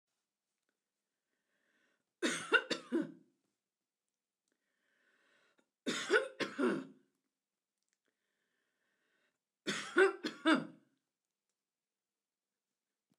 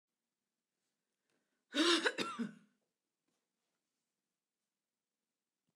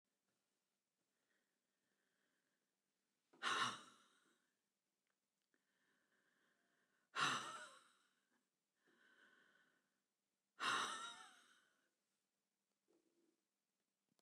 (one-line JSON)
{"three_cough_length": "13.2 s", "three_cough_amplitude": 5266, "three_cough_signal_mean_std_ratio": 0.27, "cough_length": "5.8 s", "cough_amplitude": 4341, "cough_signal_mean_std_ratio": 0.25, "exhalation_length": "14.2 s", "exhalation_amplitude": 1524, "exhalation_signal_mean_std_ratio": 0.25, "survey_phase": "beta (2021-08-13 to 2022-03-07)", "age": "65+", "gender": "Female", "wearing_mask": "No", "symptom_none": true, "smoker_status": "Never smoked", "respiratory_condition_asthma": false, "respiratory_condition_other": false, "recruitment_source": "REACT", "submission_delay": "1 day", "covid_test_result": "Negative", "covid_test_method": "RT-qPCR"}